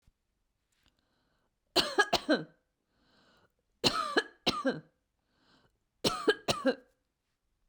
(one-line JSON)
{"three_cough_length": "7.7 s", "three_cough_amplitude": 9310, "three_cough_signal_mean_std_ratio": 0.33, "survey_phase": "beta (2021-08-13 to 2022-03-07)", "age": "45-64", "gender": "Female", "wearing_mask": "No", "symptom_runny_or_blocked_nose": true, "symptom_onset": "2 days", "smoker_status": "Ex-smoker", "respiratory_condition_asthma": false, "respiratory_condition_other": false, "recruitment_source": "REACT", "submission_delay": "1 day", "covid_test_result": "Negative", "covid_test_method": "RT-qPCR", "influenza_a_test_result": "Negative", "influenza_b_test_result": "Negative"}